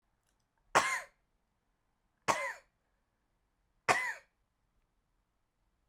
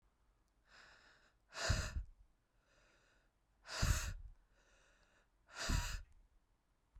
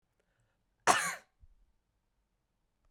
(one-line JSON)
{"three_cough_length": "5.9 s", "three_cough_amplitude": 8697, "three_cough_signal_mean_std_ratio": 0.25, "exhalation_length": "7.0 s", "exhalation_amplitude": 2450, "exhalation_signal_mean_std_ratio": 0.37, "cough_length": "2.9 s", "cough_amplitude": 12061, "cough_signal_mean_std_ratio": 0.21, "survey_phase": "beta (2021-08-13 to 2022-03-07)", "age": "18-44", "gender": "Female", "wearing_mask": "No", "symptom_cough_any": true, "symptom_runny_or_blocked_nose": true, "symptom_fatigue": true, "symptom_headache": true, "symptom_other": true, "smoker_status": "Never smoked", "respiratory_condition_asthma": true, "respiratory_condition_other": false, "recruitment_source": "Test and Trace", "submission_delay": "3 days", "covid_test_result": "Positive", "covid_test_method": "LFT"}